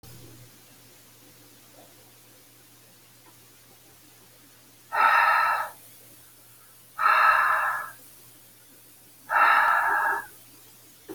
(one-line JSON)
{"exhalation_length": "11.1 s", "exhalation_amplitude": 16340, "exhalation_signal_mean_std_ratio": 0.43, "survey_phase": "alpha (2021-03-01 to 2021-08-12)", "age": "45-64", "gender": "Female", "wearing_mask": "No", "symptom_none": true, "symptom_onset": "8 days", "smoker_status": "Never smoked", "respiratory_condition_asthma": false, "respiratory_condition_other": false, "recruitment_source": "REACT", "submission_delay": "1 day", "covid_test_result": "Negative", "covid_test_method": "RT-qPCR"}